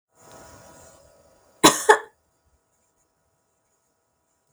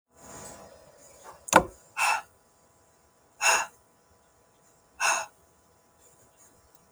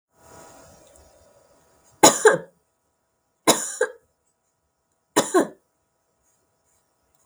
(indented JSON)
{
  "cough_length": "4.5 s",
  "cough_amplitude": 32768,
  "cough_signal_mean_std_ratio": 0.18,
  "exhalation_length": "6.9 s",
  "exhalation_amplitude": 32355,
  "exhalation_signal_mean_std_ratio": 0.28,
  "three_cough_length": "7.3 s",
  "three_cough_amplitude": 32768,
  "three_cough_signal_mean_std_ratio": 0.24,
  "survey_phase": "beta (2021-08-13 to 2022-03-07)",
  "age": "45-64",
  "gender": "Female",
  "wearing_mask": "No",
  "symptom_runny_or_blocked_nose": true,
  "symptom_sore_throat": true,
  "symptom_fatigue": true,
  "symptom_headache": true,
  "symptom_other": true,
  "smoker_status": "Never smoked",
  "respiratory_condition_asthma": false,
  "respiratory_condition_other": false,
  "recruitment_source": "Test and Trace",
  "submission_delay": "3 days",
  "covid_test_result": "Negative",
  "covid_test_method": "RT-qPCR"
}